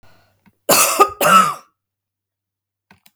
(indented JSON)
{
  "cough_length": "3.2 s",
  "cough_amplitude": 32768,
  "cough_signal_mean_std_ratio": 0.38,
  "survey_phase": "beta (2021-08-13 to 2022-03-07)",
  "age": "65+",
  "gender": "Female",
  "wearing_mask": "No",
  "symptom_none": true,
  "smoker_status": "Never smoked",
  "respiratory_condition_asthma": false,
  "respiratory_condition_other": false,
  "recruitment_source": "REACT",
  "submission_delay": "2 days",
  "covid_test_result": "Negative",
  "covid_test_method": "RT-qPCR"
}